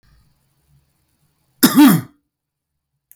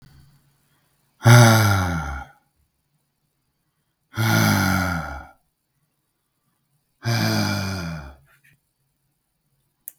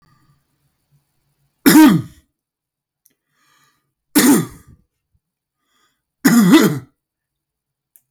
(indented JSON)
{
  "cough_length": "3.2 s",
  "cough_amplitude": 32768,
  "cough_signal_mean_std_ratio": 0.28,
  "exhalation_length": "10.0 s",
  "exhalation_amplitude": 32766,
  "exhalation_signal_mean_std_ratio": 0.39,
  "three_cough_length": "8.1 s",
  "three_cough_amplitude": 32768,
  "three_cough_signal_mean_std_ratio": 0.32,
  "survey_phase": "beta (2021-08-13 to 2022-03-07)",
  "age": "45-64",
  "gender": "Male",
  "wearing_mask": "No",
  "symptom_sore_throat": true,
  "symptom_loss_of_taste": true,
  "smoker_status": "Ex-smoker",
  "respiratory_condition_asthma": false,
  "respiratory_condition_other": false,
  "recruitment_source": "Test and Trace",
  "submission_delay": "1 day",
  "covid_test_result": "Negative",
  "covid_test_method": "RT-qPCR"
}